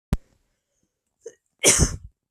cough_length: 2.3 s
cough_amplitude: 30659
cough_signal_mean_std_ratio: 0.3
survey_phase: beta (2021-08-13 to 2022-03-07)
age: 18-44
gender: Female
wearing_mask: 'No'
symptom_none: true
smoker_status: Never smoked
respiratory_condition_asthma: false
respiratory_condition_other: false
recruitment_source: REACT
submission_delay: 1 day
covid_test_result: Negative
covid_test_method: RT-qPCR
influenza_a_test_result: Negative
influenza_b_test_result: Negative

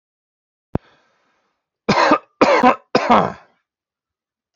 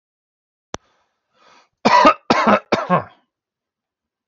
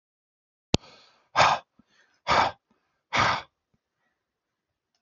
three_cough_length: 4.6 s
three_cough_amplitude: 28061
three_cough_signal_mean_std_ratio: 0.35
cough_length: 4.3 s
cough_amplitude: 32768
cough_signal_mean_std_ratio: 0.33
exhalation_length: 5.0 s
exhalation_amplitude: 32767
exhalation_signal_mean_std_ratio: 0.3
survey_phase: alpha (2021-03-01 to 2021-08-12)
age: 18-44
gender: Male
wearing_mask: 'No'
symptom_none: true
smoker_status: Never smoked
respiratory_condition_asthma: true
respiratory_condition_other: false
recruitment_source: REACT
submission_delay: 1 day
covid_test_result: Negative
covid_test_method: RT-qPCR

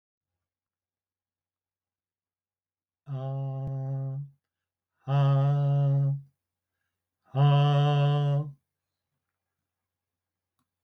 exhalation_length: 10.8 s
exhalation_amplitude: 6493
exhalation_signal_mean_std_ratio: 0.51
survey_phase: beta (2021-08-13 to 2022-03-07)
age: 65+
gender: Male
wearing_mask: 'No'
symptom_none: true
smoker_status: Never smoked
respiratory_condition_asthma: false
respiratory_condition_other: false
recruitment_source: REACT
submission_delay: 9 days
covid_test_result: Negative
covid_test_method: RT-qPCR
influenza_a_test_result: Negative
influenza_b_test_result: Negative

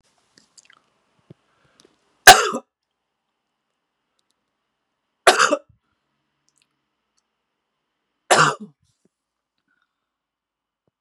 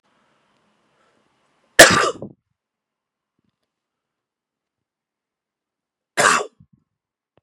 three_cough_length: 11.0 s
three_cough_amplitude: 32768
three_cough_signal_mean_std_ratio: 0.17
cough_length: 7.4 s
cough_amplitude: 32768
cough_signal_mean_std_ratio: 0.19
survey_phase: beta (2021-08-13 to 2022-03-07)
age: 45-64
gender: Male
wearing_mask: 'Yes'
symptom_cough_any: true
symptom_runny_or_blocked_nose: true
symptom_fever_high_temperature: true
symptom_headache: true
symptom_loss_of_taste: true
smoker_status: Never smoked
respiratory_condition_asthma: false
respiratory_condition_other: false
recruitment_source: Test and Trace
submission_delay: 2 days
covid_test_result: Positive
covid_test_method: RT-qPCR
covid_ct_value: 18.4
covid_ct_gene: ORF1ab gene
covid_ct_mean: 18.9
covid_viral_load: 620000 copies/ml
covid_viral_load_category: Low viral load (10K-1M copies/ml)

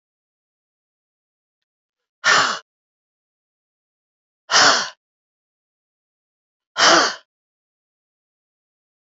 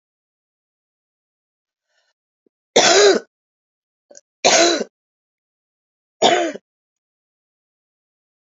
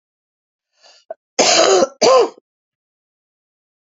exhalation_length: 9.1 s
exhalation_amplitude: 30496
exhalation_signal_mean_std_ratio: 0.26
three_cough_length: 8.4 s
three_cough_amplitude: 29503
three_cough_signal_mean_std_ratio: 0.29
cough_length: 3.8 s
cough_amplitude: 30591
cough_signal_mean_std_ratio: 0.38
survey_phase: beta (2021-08-13 to 2022-03-07)
age: 65+
gender: Female
wearing_mask: 'No'
symptom_cough_any: true
symptom_runny_or_blocked_nose: true
symptom_shortness_of_breath: true
symptom_fatigue: true
symptom_fever_high_temperature: true
symptom_other: true
symptom_onset: 3 days
smoker_status: Ex-smoker
respiratory_condition_asthma: false
respiratory_condition_other: true
recruitment_source: Test and Trace
submission_delay: 2 days
covid_test_result: Positive
covid_test_method: RT-qPCR
covid_ct_value: 18.9
covid_ct_gene: ORF1ab gene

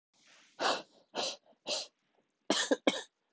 exhalation_length: 3.3 s
exhalation_amplitude: 7377
exhalation_signal_mean_std_ratio: 0.39
survey_phase: beta (2021-08-13 to 2022-03-07)
age: 45-64
gender: Female
wearing_mask: 'No'
symptom_cough_any: true
symptom_runny_or_blocked_nose: true
symptom_shortness_of_breath: true
symptom_sore_throat: true
symptom_abdominal_pain: true
symptom_fever_high_temperature: true
symptom_headache: true
symptom_change_to_sense_of_smell_or_taste: true
symptom_loss_of_taste: true
smoker_status: Never smoked
respiratory_condition_asthma: true
respiratory_condition_other: false
recruitment_source: Test and Trace
submission_delay: 2 days
covid_test_result: Positive
covid_test_method: LFT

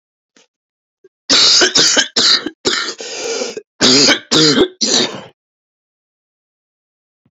cough_length: 7.3 s
cough_amplitude: 32768
cough_signal_mean_std_ratio: 0.51
survey_phase: alpha (2021-03-01 to 2021-08-12)
age: 45-64
gender: Male
wearing_mask: 'No'
symptom_cough_any: true
symptom_shortness_of_breath: true
symptom_fatigue: true
symptom_headache: true
symptom_onset: 5 days
smoker_status: Ex-smoker
respiratory_condition_asthma: false
respiratory_condition_other: false
recruitment_source: Test and Trace
submission_delay: 2 days
covid_test_result: Positive
covid_test_method: ePCR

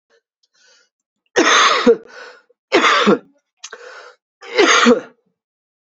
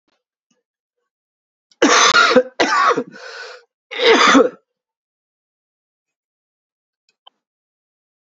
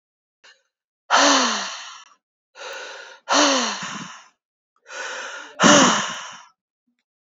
three_cough_length: 5.9 s
three_cough_amplitude: 32767
three_cough_signal_mean_std_ratio: 0.43
cough_length: 8.3 s
cough_amplitude: 32768
cough_signal_mean_std_ratio: 0.36
exhalation_length: 7.3 s
exhalation_amplitude: 30192
exhalation_signal_mean_std_ratio: 0.43
survey_phase: alpha (2021-03-01 to 2021-08-12)
age: 45-64
gender: Male
wearing_mask: 'No'
symptom_cough_any: true
symptom_headache: true
symptom_onset: 3 days
smoker_status: Never smoked
respiratory_condition_asthma: false
respiratory_condition_other: false
recruitment_source: Test and Trace
submission_delay: 2 days
covid_test_result: Positive
covid_test_method: RT-qPCR
covid_ct_value: 19.3
covid_ct_gene: ORF1ab gene
covid_ct_mean: 19.9
covid_viral_load: 300000 copies/ml
covid_viral_load_category: Low viral load (10K-1M copies/ml)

